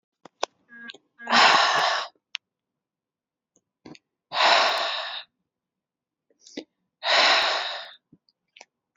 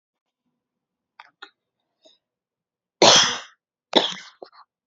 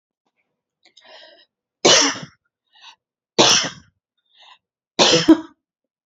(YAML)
exhalation_length: 9.0 s
exhalation_amplitude: 21826
exhalation_signal_mean_std_ratio: 0.4
cough_length: 4.9 s
cough_amplitude: 32767
cough_signal_mean_std_ratio: 0.24
three_cough_length: 6.1 s
three_cough_amplitude: 32262
three_cough_signal_mean_std_ratio: 0.32
survey_phase: beta (2021-08-13 to 2022-03-07)
age: 18-44
gender: Female
wearing_mask: 'No'
symptom_none: true
smoker_status: Never smoked
respiratory_condition_asthma: false
respiratory_condition_other: false
recruitment_source: REACT
submission_delay: 1 day
covid_test_result: Negative
covid_test_method: RT-qPCR
influenza_a_test_result: Unknown/Void
influenza_b_test_result: Unknown/Void